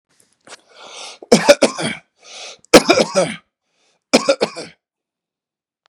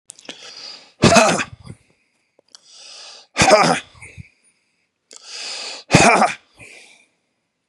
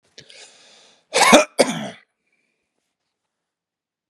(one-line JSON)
{"three_cough_length": "5.9 s", "three_cough_amplitude": 32768, "three_cough_signal_mean_std_ratio": 0.32, "exhalation_length": "7.7 s", "exhalation_amplitude": 32768, "exhalation_signal_mean_std_ratio": 0.36, "cough_length": "4.1 s", "cough_amplitude": 32768, "cough_signal_mean_std_ratio": 0.26, "survey_phase": "beta (2021-08-13 to 2022-03-07)", "age": "45-64", "gender": "Male", "wearing_mask": "No", "symptom_none": true, "smoker_status": "Ex-smoker", "respiratory_condition_asthma": false, "respiratory_condition_other": false, "recruitment_source": "REACT", "submission_delay": "1 day", "covid_test_result": "Negative", "covid_test_method": "RT-qPCR", "influenza_a_test_result": "Negative", "influenza_b_test_result": "Negative"}